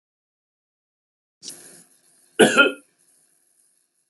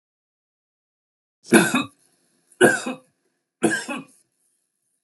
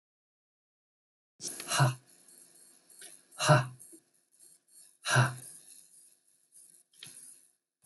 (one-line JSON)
{"cough_length": "4.1 s", "cough_amplitude": 30000, "cough_signal_mean_std_ratio": 0.22, "three_cough_length": "5.0 s", "three_cough_amplitude": 29658, "three_cough_signal_mean_std_ratio": 0.29, "exhalation_length": "7.9 s", "exhalation_amplitude": 10947, "exhalation_signal_mean_std_ratio": 0.28, "survey_phase": "beta (2021-08-13 to 2022-03-07)", "age": "65+", "gender": "Male", "wearing_mask": "No", "symptom_none": true, "smoker_status": "Never smoked", "respiratory_condition_asthma": false, "respiratory_condition_other": false, "recruitment_source": "REACT", "submission_delay": "1 day", "covid_test_result": "Negative", "covid_test_method": "RT-qPCR", "influenza_a_test_result": "Negative", "influenza_b_test_result": "Negative"}